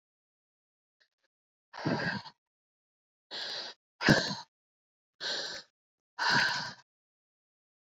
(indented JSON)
{
  "exhalation_length": "7.9 s",
  "exhalation_amplitude": 14429,
  "exhalation_signal_mean_std_ratio": 0.34,
  "survey_phase": "beta (2021-08-13 to 2022-03-07)",
  "age": "65+",
  "gender": "Female",
  "wearing_mask": "No",
  "symptom_none": true,
  "smoker_status": "Ex-smoker",
  "respiratory_condition_asthma": false,
  "respiratory_condition_other": false,
  "recruitment_source": "REACT",
  "submission_delay": "1 day",
  "covid_test_result": "Negative",
  "covid_test_method": "RT-qPCR"
}